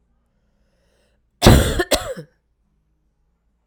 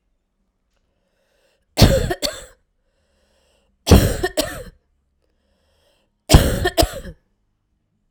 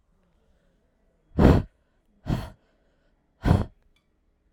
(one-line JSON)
{"cough_length": "3.7 s", "cough_amplitude": 32768, "cough_signal_mean_std_ratio": 0.27, "three_cough_length": "8.1 s", "three_cough_amplitude": 32768, "three_cough_signal_mean_std_ratio": 0.3, "exhalation_length": "4.5 s", "exhalation_amplitude": 23459, "exhalation_signal_mean_std_ratio": 0.27, "survey_phase": "alpha (2021-03-01 to 2021-08-12)", "age": "45-64", "gender": "Female", "wearing_mask": "No", "symptom_abdominal_pain": true, "symptom_diarrhoea": true, "symptom_fatigue": true, "symptom_fever_high_temperature": true, "symptom_headache": true, "symptom_change_to_sense_of_smell_or_taste": true, "symptom_loss_of_taste": true, "symptom_onset": "3 days", "smoker_status": "Never smoked", "respiratory_condition_asthma": false, "respiratory_condition_other": false, "recruitment_source": "Test and Trace", "submission_delay": "2 days", "covid_test_result": "Positive", "covid_test_method": "ePCR"}